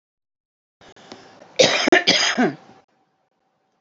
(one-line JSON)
{"cough_length": "3.8 s", "cough_amplitude": 32649, "cough_signal_mean_std_ratio": 0.37, "survey_phase": "alpha (2021-03-01 to 2021-08-12)", "age": "45-64", "gender": "Female", "wearing_mask": "No", "symptom_none": true, "symptom_onset": "12 days", "smoker_status": "Current smoker (11 or more cigarettes per day)", "respiratory_condition_asthma": false, "respiratory_condition_other": false, "recruitment_source": "REACT", "submission_delay": "1 day", "covid_test_result": "Negative", "covid_test_method": "RT-qPCR"}